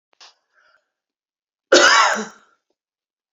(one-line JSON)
{"cough_length": "3.3 s", "cough_amplitude": 28876, "cough_signal_mean_std_ratio": 0.31, "survey_phase": "beta (2021-08-13 to 2022-03-07)", "age": "65+", "gender": "Female", "wearing_mask": "No", "symptom_none": true, "smoker_status": "Ex-smoker", "respiratory_condition_asthma": false, "respiratory_condition_other": false, "recruitment_source": "REACT", "submission_delay": "1 day", "covid_test_result": "Negative", "covid_test_method": "RT-qPCR"}